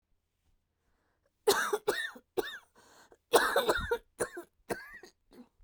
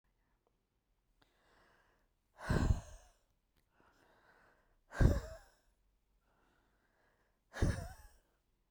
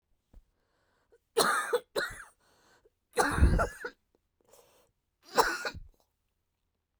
{"cough_length": "5.6 s", "cough_amplitude": 12599, "cough_signal_mean_std_ratio": 0.38, "exhalation_length": "8.7 s", "exhalation_amplitude": 6373, "exhalation_signal_mean_std_ratio": 0.25, "three_cough_length": "7.0 s", "three_cough_amplitude": 10653, "three_cough_signal_mean_std_ratio": 0.35, "survey_phase": "beta (2021-08-13 to 2022-03-07)", "age": "45-64", "gender": "Female", "wearing_mask": "No", "symptom_runny_or_blocked_nose": true, "smoker_status": "Never smoked", "respiratory_condition_asthma": false, "respiratory_condition_other": false, "recruitment_source": "REACT", "submission_delay": "1 day", "covid_test_result": "Negative", "covid_test_method": "RT-qPCR", "influenza_a_test_result": "Unknown/Void", "influenza_b_test_result": "Unknown/Void"}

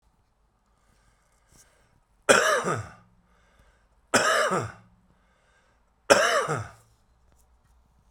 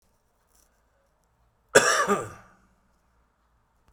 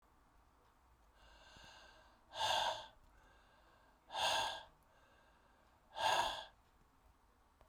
{"three_cough_length": "8.1 s", "three_cough_amplitude": 29011, "three_cough_signal_mean_std_ratio": 0.34, "cough_length": "3.9 s", "cough_amplitude": 27346, "cough_signal_mean_std_ratio": 0.25, "exhalation_length": "7.7 s", "exhalation_amplitude": 2512, "exhalation_signal_mean_std_ratio": 0.39, "survey_phase": "beta (2021-08-13 to 2022-03-07)", "age": "45-64", "gender": "Male", "wearing_mask": "No", "symptom_cough_any": true, "symptom_change_to_sense_of_smell_or_taste": true, "symptom_loss_of_taste": true, "symptom_onset": "3 days", "smoker_status": "Current smoker (1 to 10 cigarettes per day)", "respiratory_condition_asthma": false, "respiratory_condition_other": false, "recruitment_source": "Test and Trace", "submission_delay": "2 days", "covid_test_result": "Positive", "covid_test_method": "RT-qPCR", "covid_ct_value": 25.3, "covid_ct_gene": "ORF1ab gene"}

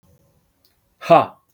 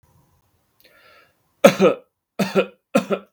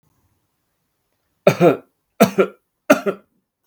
{"exhalation_length": "1.5 s", "exhalation_amplitude": 32766, "exhalation_signal_mean_std_ratio": 0.26, "cough_length": "3.3 s", "cough_amplitude": 32768, "cough_signal_mean_std_ratio": 0.31, "three_cough_length": "3.7 s", "three_cough_amplitude": 32768, "three_cough_signal_mean_std_ratio": 0.29, "survey_phase": "beta (2021-08-13 to 2022-03-07)", "age": "18-44", "gender": "Male", "wearing_mask": "No", "symptom_none": true, "smoker_status": "Never smoked", "respiratory_condition_asthma": false, "respiratory_condition_other": false, "recruitment_source": "REACT", "submission_delay": "4 days", "covid_test_result": "Negative", "covid_test_method": "RT-qPCR", "influenza_a_test_result": "Unknown/Void", "influenza_b_test_result": "Unknown/Void"}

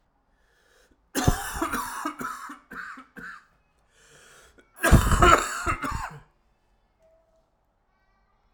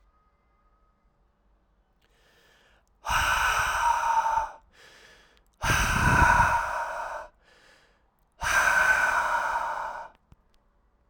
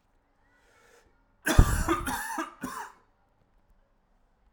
{"cough_length": "8.5 s", "cough_amplitude": 29263, "cough_signal_mean_std_ratio": 0.34, "exhalation_length": "11.1 s", "exhalation_amplitude": 14242, "exhalation_signal_mean_std_ratio": 0.55, "three_cough_length": "4.5 s", "three_cough_amplitude": 27401, "three_cough_signal_mean_std_ratio": 0.3, "survey_phase": "alpha (2021-03-01 to 2021-08-12)", "age": "18-44", "gender": "Male", "wearing_mask": "No", "symptom_cough_any": true, "symptom_diarrhoea": true, "symptom_fatigue": true, "symptom_change_to_sense_of_smell_or_taste": true, "symptom_onset": "3 days", "smoker_status": "Never smoked", "respiratory_condition_asthma": false, "respiratory_condition_other": false, "recruitment_source": "Test and Trace", "submission_delay": "1 day", "covid_test_result": "Positive", "covid_test_method": "RT-qPCR", "covid_ct_value": 14.3, "covid_ct_gene": "ORF1ab gene", "covid_ct_mean": 15.5, "covid_viral_load": "8300000 copies/ml", "covid_viral_load_category": "High viral load (>1M copies/ml)"}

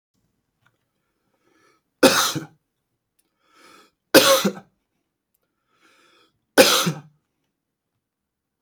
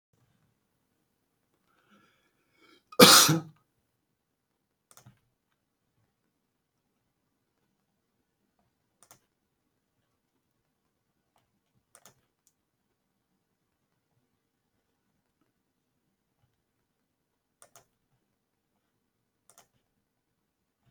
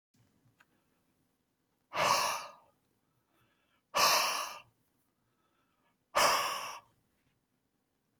{"three_cough_length": "8.6 s", "three_cough_amplitude": 32768, "three_cough_signal_mean_std_ratio": 0.25, "cough_length": "20.9 s", "cough_amplitude": 32266, "cough_signal_mean_std_ratio": 0.11, "exhalation_length": "8.2 s", "exhalation_amplitude": 6796, "exhalation_signal_mean_std_ratio": 0.35, "survey_phase": "beta (2021-08-13 to 2022-03-07)", "age": "45-64", "gender": "Male", "wearing_mask": "No", "symptom_runny_or_blocked_nose": true, "symptom_headache": true, "symptom_onset": "2 days", "smoker_status": "Never smoked", "respiratory_condition_asthma": true, "respiratory_condition_other": false, "recruitment_source": "Test and Trace", "submission_delay": "1 day", "covid_test_result": "Positive", "covid_test_method": "RT-qPCR", "covid_ct_value": 11.3, "covid_ct_gene": "ORF1ab gene"}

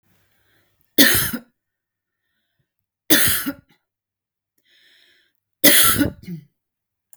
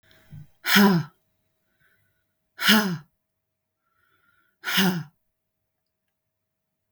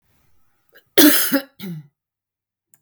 {"three_cough_length": "7.2 s", "three_cough_amplitude": 32768, "three_cough_signal_mean_std_ratio": 0.32, "exhalation_length": "6.9 s", "exhalation_amplitude": 26854, "exhalation_signal_mean_std_ratio": 0.31, "cough_length": "2.8 s", "cough_amplitude": 32768, "cough_signal_mean_std_ratio": 0.32, "survey_phase": "beta (2021-08-13 to 2022-03-07)", "age": "45-64", "gender": "Female", "wearing_mask": "No", "symptom_none": true, "smoker_status": "Current smoker (e-cigarettes or vapes only)", "respiratory_condition_asthma": true, "respiratory_condition_other": false, "recruitment_source": "REACT", "submission_delay": "2 days", "covid_test_result": "Negative", "covid_test_method": "RT-qPCR"}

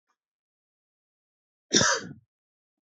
{"cough_length": "2.8 s", "cough_amplitude": 22398, "cough_signal_mean_std_ratio": 0.25, "survey_phase": "beta (2021-08-13 to 2022-03-07)", "age": "18-44", "gender": "Male", "wearing_mask": "No", "symptom_headache": true, "symptom_onset": "3 days", "smoker_status": "Never smoked", "respiratory_condition_asthma": false, "respiratory_condition_other": false, "recruitment_source": "REACT", "submission_delay": "2 days", "covid_test_result": "Negative", "covid_test_method": "RT-qPCR", "influenza_a_test_result": "Negative", "influenza_b_test_result": "Negative"}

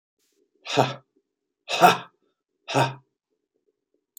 {"exhalation_length": "4.2 s", "exhalation_amplitude": 27179, "exhalation_signal_mean_std_ratio": 0.28, "survey_phase": "beta (2021-08-13 to 2022-03-07)", "age": "45-64", "gender": "Male", "wearing_mask": "No", "symptom_none": true, "smoker_status": "Never smoked", "respiratory_condition_asthma": false, "respiratory_condition_other": false, "recruitment_source": "REACT", "submission_delay": "1 day", "covid_test_result": "Negative", "covid_test_method": "RT-qPCR", "influenza_a_test_result": "Negative", "influenza_b_test_result": "Negative"}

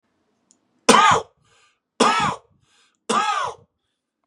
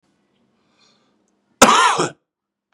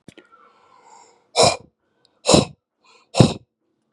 {"three_cough_length": "4.3 s", "three_cough_amplitude": 32767, "three_cough_signal_mean_std_ratio": 0.38, "cough_length": "2.7 s", "cough_amplitude": 32768, "cough_signal_mean_std_ratio": 0.31, "exhalation_length": "3.9 s", "exhalation_amplitude": 32768, "exhalation_signal_mean_std_ratio": 0.28, "survey_phase": "beta (2021-08-13 to 2022-03-07)", "age": "18-44", "gender": "Male", "wearing_mask": "No", "symptom_runny_or_blocked_nose": true, "symptom_sore_throat": true, "symptom_fatigue": true, "symptom_headache": true, "smoker_status": "Never smoked", "respiratory_condition_asthma": false, "respiratory_condition_other": false, "recruitment_source": "Test and Trace", "submission_delay": "2 days", "covid_test_result": "Positive", "covid_test_method": "RT-qPCR", "covid_ct_value": 33.5, "covid_ct_gene": "ORF1ab gene"}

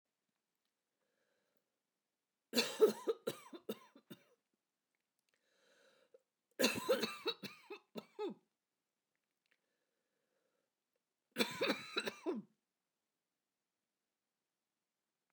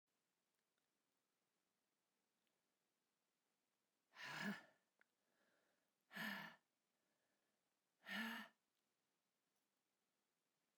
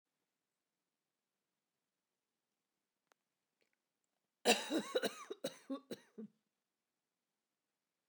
{"three_cough_length": "15.3 s", "three_cough_amplitude": 4779, "three_cough_signal_mean_std_ratio": 0.26, "exhalation_length": "10.8 s", "exhalation_amplitude": 452, "exhalation_signal_mean_std_ratio": 0.28, "cough_length": "8.1 s", "cough_amplitude": 4727, "cough_signal_mean_std_ratio": 0.22, "survey_phase": "beta (2021-08-13 to 2022-03-07)", "age": "45-64", "gender": "Female", "wearing_mask": "No", "symptom_cough_any": true, "symptom_runny_or_blocked_nose": true, "symptom_shortness_of_breath": true, "symptom_sore_throat": true, "symptom_abdominal_pain": true, "symptom_fatigue": true, "symptom_headache": true, "symptom_change_to_sense_of_smell_or_taste": true, "symptom_loss_of_taste": true, "smoker_status": "Never smoked", "respiratory_condition_asthma": false, "respiratory_condition_other": true, "recruitment_source": "Test and Trace", "submission_delay": "2 days", "covid_test_result": "Positive", "covid_test_method": "LAMP"}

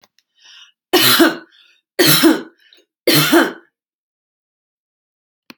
{"three_cough_length": "5.6 s", "three_cough_amplitude": 32768, "three_cough_signal_mean_std_ratio": 0.39, "survey_phase": "beta (2021-08-13 to 2022-03-07)", "age": "45-64", "gender": "Female", "wearing_mask": "No", "symptom_none": true, "smoker_status": "Never smoked", "respiratory_condition_asthma": false, "respiratory_condition_other": false, "recruitment_source": "REACT", "submission_delay": "1 day", "covid_test_result": "Negative", "covid_test_method": "RT-qPCR"}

